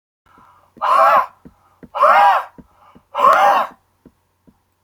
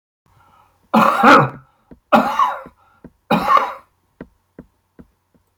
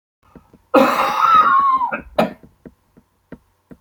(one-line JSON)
{"exhalation_length": "4.8 s", "exhalation_amplitude": 27876, "exhalation_signal_mean_std_ratio": 0.47, "three_cough_length": "5.6 s", "three_cough_amplitude": 31979, "three_cough_signal_mean_std_ratio": 0.39, "cough_length": "3.8 s", "cough_amplitude": 29725, "cough_signal_mean_std_ratio": 0.52, "survey_phase": "beta (2021-08-13 to 2022-03-07)", "age": "65+", "gender": "Male", "wearing_mask": "No", "symptom_cough_any": true, "symptom_onset": "10 days", "smoker_status": "Ex-smoker", "respiratory_condition_asthma": false, "respiratory_condition_other": false, "recruitment_source": "REACT", "submission_delay": "4 days", "covid_test_result": "Negative", "covid_test_method": "RT-qPCR", "influenza_a_test_result": "Negative", "influenza_b_test_result": "Negative"}